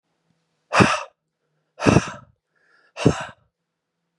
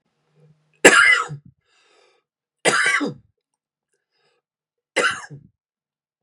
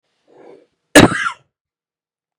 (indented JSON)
{
  "exhalation_length": "4.2 s",
  "exhalation_amplitude": 29653,
  "exhalation_signal_mean_std_ratio": 0.29,
  "three_cough_length": "6.2 s",
  "three_cough_amplitude": 32768,
  "three_cough_signal_mean_std_ratio": 0.31,
  "cough_length": "2.4 s",
  "cough_amplitude": 32768,
  "cough_signal_mean_std_ratio": 0.25,
  "survey_phase": "beta (2021-08-13 to 2022-03-07)",
  "age": "18-44",
  "gender": "Male",
  "wearing_mask": "No",
  "symptom_cough_any": true,
  "symptom_sore_throat": true,
  "smoker_status": "Ex-smoker",
  "respiratory_condition_asthma": false,
  "respiratory_condition_other": false,
  "recruitment_source": "REACT",
  "submission_delay": "0 days",
  "covid_test_result": "Negative",
  "covid_test_method": "RT-qPCR"
}